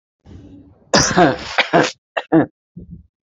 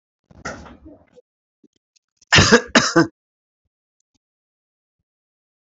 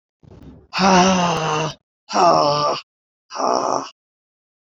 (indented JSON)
{
  "three_cough_length": "3.3 s",
  "three_cough_amplitude": 32767,
  "three_cough_signal_mean_std_ratio": 0.42,
  "cough_length": "5.6 s",
  "cough_amplitude": 29571,
  "cough_signal_mean_std_ratio": 0.25,
  "exhalation_length": "4.7 s",
  "exhalation_amplitude": 27226,
  "exhalation_signal_mean_std_ratio": 0.55,
  "survey_phase": "beta (2021-08-13 to 2022-03-07)",
  "age": "65+",
  "gender": "Female",
  "wearing_mask": "Yes",
  "symptom_none": true,
  "smoker_status": "Ex-smoker",
  "respiratory_condition_asthma": false,
  "respiratory_condition_other": false,
  "recruitment_source": "REACT",
  "submission_delay": "2 days",
  "covid_test_result": "Negative",
  "covid_test_method": "RT-qPCR",
  "influenza_a_test_result": "Negative",
  "influenza_b_test_result": "Negative"
}